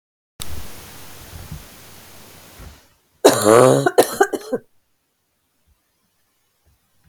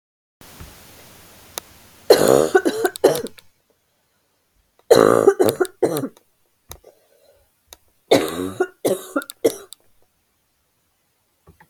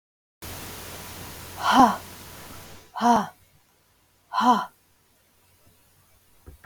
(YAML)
cough_length: 7.1 s
cough_amplitude: 32768
cough_signal_mean_std_ratio: 0.31
three_cough_length: 11.7 s
three_cough_amplitude: 32768
three_cough_signal_mean_std_ratio: 0.32
exhalation_length: 6.7 s
exhalation_amplitude: 23251
exhalation_signal_mean_std_ratio: 0.35
survey_phase: beta (2021-08-13 to 2022-03-07)
age: 45-64
gender: Female
wearing_mask: 'No'
symptom_cough_any: true
smoker_status: Never smoked
respiratory_condition_asthma: false
respiratory_condition_other: false
recruitment_source: Test and Trace
submission_delay: 2 days
covid_test_result: Negative
covid_test_method: RT-qPCR